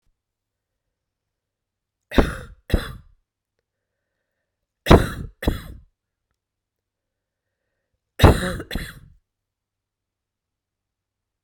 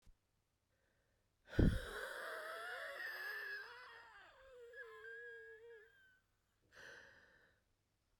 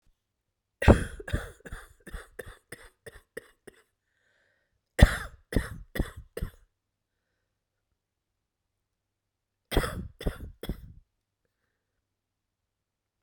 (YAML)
three_cough_length: 11.4 s
three_cough_amplitude: 32768
three_cough_signal_mean_std_ratio: 0.2
exhalation_length: 8.2 s
exhalation_amplitude: 3886
exhalation_signal_mean_std_ratio: 0.38
cough_length: 13.2 s
cough_amplitude: 26370
cough_signal_mean_std_ratio: 0.2
survey_phase: beta (2021-08-13 to 2022-03-07)
age: 45-64
gender: Female
wearing_mask: 'No'
symptom_cough_any: true
symptom_runny_or_blocked_nose: true
symptom_sore_throat: true
symptom_diarrhoea: true
symptom_fever_high_temperature: true
symptom_headache: true
symptom_change_to_sense_of_smell_or_taste: true
symptom_loss_of_taste: true
symptom_onset: 8 days
smoker_status: Ex-smoker
respiratory_condition_asthma: false
respiratory_condition_other: false
recruitment_source: Test and Trace
submission_delay: 2 days
covid_test_result: Positive
covid_test_method: RT-qPCR
covid_ct_value: 24.1
covid_ct_gene: ORF1ab gene